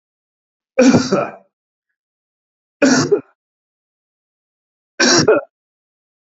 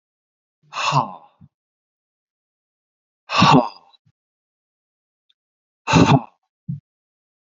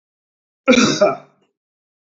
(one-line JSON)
{"three_cough_length": "6.2 s", "three_cough_amplitude": 32767, "three_cough_signal_mean_std_ratio": 0.35, "exhalation_length": "7.4 s", "exhalation_amplitude": 29600, "exhalation_signal_mean_std_ratio": 0.28, "cough_length": "2.1 s", "cough_amplitude": 28919, "cough_signal_mean_std_ratio": 0.36, "survey_phase": "beta (2021-08-13 to 2022-03-07)", "age": "65+", "gender": "Male", "wearing_mask": "No", "symptom_none": true, "smoker_status": "Ex-smoker", "respiratory_condition_asthma": false, "respiratory_condition_other": false, "recruitment_source": "REACT", "submission_delay": "0 days", "covid_test_result": "Negative", "covid_test_method": "RT-qPCR"}